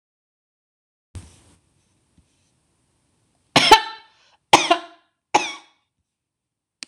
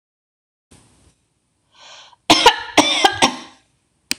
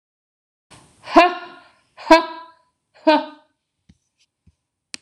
{"three_cough_length": "6.9 s", "three_cough_amplitude": 26028, "three_cough_signal_mean_std_ratio": 0.21, "cough_length": "4.2 s", "cough_amplitude": 26028, "cough_signal_mean_std_ratio": 0.32, "exhalation_length": "5.0 s", "exhalation_amplitude": 26028, "exhalation_signal_mean_std_ratio": 0.26, "survey_phase": "beta (2021-08-13 to 2022-03-07)", "age": "65+", "gender": "Female", "wearing_mask": "No", "symptom_none": true, "smoker_status": "Never smoked", "respiratory_condition_asthma": false, "respiratory_condition_other": false, "recruitment_source": "REACT", "submission_delay": "2 days", "covid_test_result": "Negative", "covid_test_method": "RT-qPCR"}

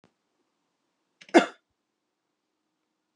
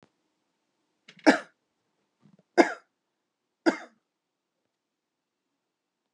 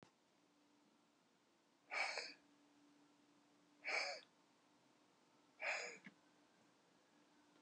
{"cough_length": "3.2 s", "cough_amplitude": 22854, "cough_signal_mean_std_ratio": 0.13, "three_cough_length": "6.1 s", "three_cough_amplitude": 24775, "three_cough_signal_mean_std_ratio": 0.16, "exhalation_length": "7.6 s", "exhalation_amplitude": 970, "exhalation_signal_mean_std_ratio": 0.36, "survey_phase": "beta (2021-08-13 to 2022-03-07)", "age": "45-64", "gender": "Female", "wearing_mask": "No", "symptom_none": true, "symptom_onset": "8 days", "smoker_status": "Current smoker (e-cigarettes or vapes only)", "respiratory_condition_asthma": false, "respiratory_condition_other": false, "recruitment_source": "REACT", "submission_delay": "3 days", "covid_test_result": "Negative", "covid_test_method": "RT-qPCR"}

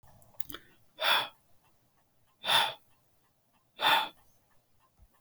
{"exhalation_length": "5.2 s", "exhalation_amplitude": 11609, "exhalation_signal_mean_std_ratio": 0.33, "survey_phase": "beta (2021-08-13 to 2022-03-07)", "age": "45-64", "gender": "Male", "wearing_mask": "No", "symptom_none": true, "smoker_status": "Never smoked", "respiratory_condition_asthma": false, "respiratory_condition_other": false, "recruitment_source": "REACT", "submission_delay": "3 days", "covid_test_result": "Negative", "covid_test_method": "RT-qPCR"}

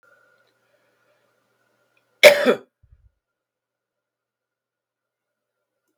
{"cough_length": "6.0 s", "cough_amplitude": 32768, "cough_signal_mean_std_ratio": 0.16, "survey_phase": "beta (2021-08-13 to 2022-03-07)", "age": "65+", "gender": "Male", "wearing_mask": "No", "symptom_runny_or_blocked_nose": true, "smoker_status": "Never smoked", "respiratory_condition_asthma": false, "respiratory_condition_other": false, "recruitment_source": "REACT", "submission_delay": "2 days", "covid_test_result": "Negative", "covid_test_method": "RT-qPCR", "influenza_a_test_result": "Negative", "influenza_b_test_result": "Negative"}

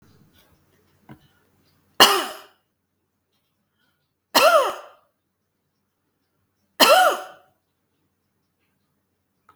{"three_cough_length": "9.6 s", "three_cough_amplitude": 32768, "three_cough_signal_mean_std_ratio": 0.25, "survey_phase": "beta (2021-08-13 to 2022-03-07)", "age": "45-64", "gender": "Female", "wearing_mask": "No", "symptom_none": true, "smoker_status": "Never smoked", "respiratory_condition_asthma": false, "respiratory_condition_other": false, "recruitment_source": "REACT", "submission_delay": "2 days", "covid_test_result": "Negative", "covid_test_method": "RT-qPCR"}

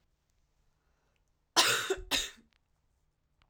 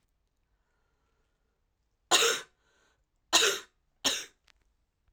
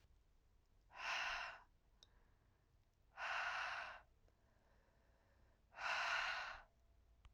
{"cough_length": "3.5 s", "cough_amplitude": 12017, "cough_signal_mean_std_ratio": 0.3, "three_cough_length": "5.1 s", "three_cough_amplitude": 13569, "three_cough_signal_mean_std_ratio": 0.28, "exhalation_length": "7.3 s", "exhalation_amplitude": 1108, "exhalation_signal_mean_std_ratio": 0.5, "survey_phase": "alpha (2021-03-01 to 2021-08-12)", "age": "18-44", "gender": "Female", "wearing_mask": "No", "symptom_cough_any": true, "symptom_new_continuous_cough": true, "symptom_fatigue": true, "symptom_headache": true, "symptom_change_to_sense_of_smell_or_taste": true, "smoker_status": "Prefer not to say", "respiratory_condition_asthma": true, "respiratory_condition_other": false, "recruitment_source": "Test and Trace", "submission_delay": "2 days", "covid_test_result": "Positive", "covid_test_method": "RT-qPCR", "covid_ct_value": 19.4, "covid_ct_gene": "N gene"}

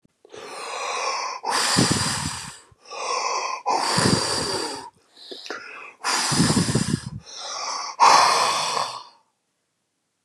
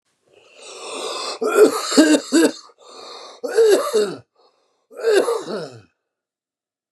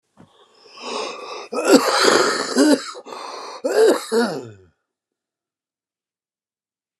{"exhalation_length": "10.2 s", "exhalation_amplitude": 27375, "exhalation_signal_mean_std_ratio": 0.64, "three_cough_length": "6.9 s", "three_cough_amplitude": 32761, "three_cough_signal_mean_std_ratio": 0.48, "cough_length": "7.0 s", "cough_amplitude": 32767, "cough_signal_mean_std_ratio": 0.46, "survey_phase": "beta (2021-08-13 to 2022-03-07)", "age": "45-64", "gender": "Male", "wearing_mask": "No", "symptom_cough_any": true, "smoker_status": "Ex-smoker", "respiratory_condition_asthma": true, "respiratory_condition_other": false, "recruitment_source": "REACT", "submission_delay": "2 days", "covid_test_result": "Positive", "covid_test_method": "RT-qPCR", "covid_ct_value": 23.0, "covid_ct_gene": "E gene", "influenza_a_test_result": "Negative", "influenza_b_test_result": "Negative"}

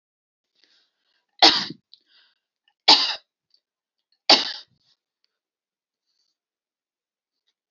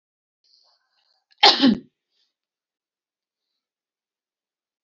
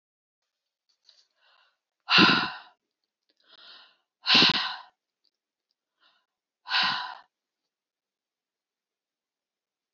{"three_cough_length": "7.7 s", "three_cough_amplitude": 32548, "three_cough_signal_mean_std_ratio": 0.2, "cough_length": "4.8 s", "cough_amplitude": 32768, "cough_signal_mean_std_ratio": 0.19, "exhalation_length": "9.9 s", "exhalation_amplitude": 17771, "exhalation_signal_mean_std_ratio": 0.26, "survey_phase": "beta (2021-08-13 to 2022-03-07)", "age": "45-64", "gender": "Female", "wearing_mask": "No", "symptom_none": true, "smoker_status": "Ex-smoker", "respiratory_condition_asthma": false, "respiratory_condition_other": false, "recruitment_source": "REACT", "submission_delay": "2 days", "covid_test_result": "Negative", "covid_test_method": "RT-qPCR", "influenza_a_test_result": "Negative", "influenza_b_test_result": "Negative"}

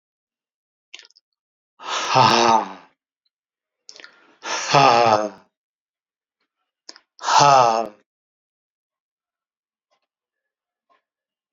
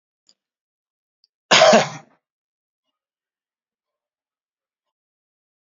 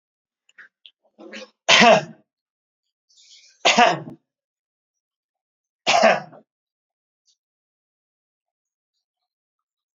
{"exhalation_length": "11.5 s", "exhalation_amplitude": 32768, "exhalation_signal_mean_std_ratio": 0.32, "cough_length": "5.6 s", "cough_amplitude": 31707, "cough_signal_mean_std_ratio": 0.2, "three_cough_length": "10.0 s", "three_cough_amplitude": 32768, "three_cough_signal_mean_std_ratio": 0.25, "survey_phase": "alpha (2021-03-01 to 2021-08-12)", "age": "65+", "gender": "Male", "wearing_mask": "No", "symptom_none": true, "smoker_status": "Never smoked", "respiratory_condition_asthma": false, "respiratory_condition_other": false, "recruitment_source": "REACT", "submission_delay": "1 day", "covid_test_result": "Negative", "covid_test_method": "RT-qPCR"}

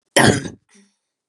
{"cough_length": "1.3 s", "cough_amplitude": 32201, "cough_signal_mean_std_ratio": 0.36, "survey_phase": "beta (2021-08-13 to 2022-03-07)", "age": "18-44", "gender": "Female", "wearing_mask": "No", "symptom_runny_or_blocked_nose": true, "smoker_status": "Never smoked", "respiratory_condition_asthma": false, "respiratory_condition_other": false, "recruitment_source": "Test and Trace", "submission_delay": "2 days", "covid_test_result": "Negative", "covid_test_method": "RT-qPCR"}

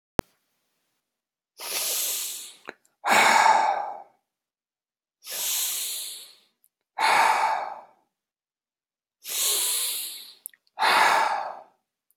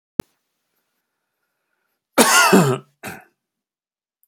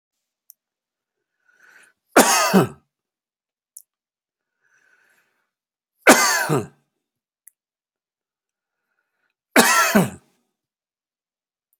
{"exhalation_length": "12.2 s", "exhalation_amplitude": 17284, "exhalation_signal_mean_std_ratio": 0.49, "cough_length": "4.3 s", "cough_amplitude": 32768, "cough_signal_mean_std_ratio": 0.31, "three_cough_length": "11.8 s", "three_cough_amplitude": 31574, "three_cough_signal_mean_std_ratio": 0.27, "survey_phase": "beta (2021-08-13 to 2022-03-07)", "age": "65+", "gender": "Male", "wearing_mask": "No", "symptom_none": true, "smoker_status": "Never smoked", "respiratory_condition_asthma": false, "respiratory_condition_other": false, "recruitment_source": "REACT", "submission_delay": "1 day", "covid_test_result": "Negative", "covid_test_method": "RT-qPCR"}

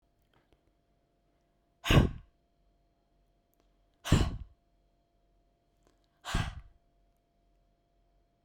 {"exhalation_length": "8.4 s", "exhalation_amplitude": 10076, "exhalation_signal_mean_std_ratio": 0.22, "survey_phase": "beta (2021-08-13 to 2022-03-07)", "age": "18-44", "gender": "Female", "wearing_mask": "No", "symptom_none": true, "symptom_onset": "12 days", "smoker_status": "Never smoked", "respiratory_condition_asthma": false, "respiratory_condition_other": false, "recruitment_source": "REACT", "submission_delay": "3 days", "covid_test_result": "Negative", "covid_test_method": "RT-qPCR", "influenza_a_test_result": "Unknown/Void", "influenza_b_test_result": "Unknown/Void"}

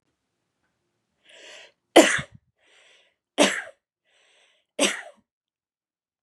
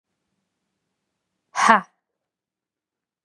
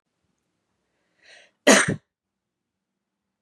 {"three_cough_length": "6.2 s", "three_cough_amplitude": 29818, "three_cough_signal_mean_std_ratio": 0.22, "exhalation_length": "3.2 s", "exhalation_amplitude": 32629, "exhalation_signal_mean_std_ratio": 0.19, "cough_length": "3.4 s", "cough_amplitude": 26628, "cough_signal_mean_std_ratio": 0.2, "survey_phase": "beta (2021-08-13 to 2022-03-07)", "age": "18-44", "gender": "Female", "wearing_mask": "No", "symptom_none": true, "smoker_status": "Never smoked", "respiratory_condition_asthma": true, "respiratory_condition_other": false, "recruitment_source": "REACT", "submission_delay": "3 days", "covid_test_result": "Negative", "covid_test_method": "RT-qPCR", "influenza_a_test_result": "Negative", "influenza_b_test_result": "Negative"}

